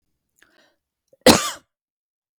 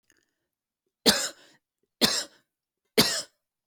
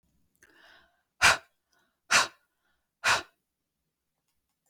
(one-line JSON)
{"cough_length": "2.4 s", "cough_amplitude": 32768, "cough_signal_mean_std_ratio": 0.2, "three_cough_length": "3.7 s", "three_cough_amplitude": 20472, "three_cough_signal_mean_std_ratio": 0.3, "exhalation_length": "4.7 s", "exhalation_amplitude": 16079, "exhalation_signal_mean_std_ratio": 0.24, "survey_phase": "beta (2021-08-13 to 2022-03-07)", "age": "45-64", "gender": "Female", "wearing_mask": "No", "symptom_none": true, "symptom_onset": "12 days", "smoker_status": "Ex-smoker", "respiratory_condition_asthma": false, "respiratory_condition_other": false, "recruitment_source": "REACT", "submission_delay": "1 day", "covid_test_result": "Negative", "covid_test_method": "RT-qPCR"}